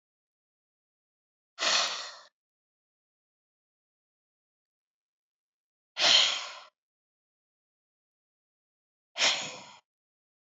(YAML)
exhalation_length: 10.5 s
exhalation_amplitude: 11407
exhalation_signal_mean_std_ratio: 0.25
survey_phase: beta (2021-08-13 to 2022-03-07)
age: 45-64
gender: Female
wearing_mask: 'No'
symptom_none: true
smoker_status: Ex-smoker
respiratory_condition_asthma: false
respiratory_condition_other: true
recruitment_source: REACT
submission_delay: 1 day
covid_test_result: Negative
covid_test_method: RT-qPCR
influenza_a_test_result: Negative
influenza_b_test_result: Negative